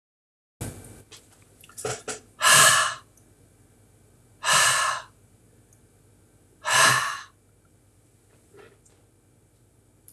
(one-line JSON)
{"exhalation_length": "10.1 s", "exhalation_amplitude": 22932, "exhalation_signal_mean_std_ratio": 0.34, "survey_phase": "beta (2021-08-13 to 2022-03-07)", "age": "65+", "gender": "Male", "wearing_mask": "No", "symptom_none": true, "smoker_status": "Ex-smoker", "respiratory_condition_asthma": false, "respiratory_condition_other": false, "recruitment_source": "REACT", "submission_delay": "3 days", "covid_test_result": "Negative", "covid_test_method": "RT-qPCR"}